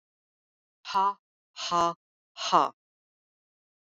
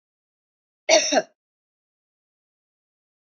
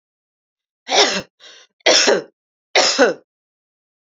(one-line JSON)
{"exhalation_length": "3.8 s", "exhalation_amplitude": 14867, "exhalation_signal_mean_std_ratio": 0.32, "cough_length": "3.2 s", "cough_amplitude": 21841, "cough_signal_mean_std_ratio": 0.23, "three_cough_length": "4.1 s", "three_cough_amplitude": 32768, "three_cough_signal_mean_std_ratio": 0.4, "survey_phase": "beta (2021-08-13 to 2022-03-07)", "age": "45-64", "gender": "Female", "wearing_mask": "No", "symptom_none": true, "smoker_status": "Never smoked", "respiratory_condition_asthma": false, "respiratory_condition_other": false, "recruitment_source": "REACT", "submission_delay": "2 days", "covid_test_result": "Negative", "covid_test_method": "RT-qPCR", "influenza_a_test_result": "Negative", "influenza_b_test_result": "Negative"}